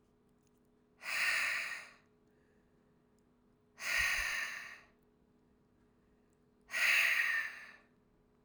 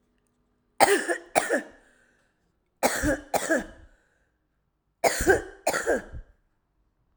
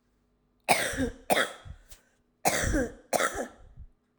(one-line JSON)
{"exhalation_length": "8.4 s", "exhalation_amplitude": 3954, "exhalation_signal_mean_std_ratio": 0.45, "three_cough_length": "7.2 s", "three_cough_amplitude": 22766, "three_cough_signal_mean_std_ratio": 0.39, "cough_length": "4.2 s", "cough_amplitude": 13322, "cough_signal_mean_std_ratio": 0.47, "survey_phase": "alpha (2021-03-01 to 2021-08-12)", "age": "45-64", "gender": "Female", "wearing_mask": "No", "symptom_none": true, "smoker_status": "Never smoked", "respiratory_condition_asthma": true, "respiratory_condition_other": false, "recruitment_source": "REACT", "submission_delay": "1 day", "covid_test_result": "Negative", "covid_test_method": "RT-qPCR"}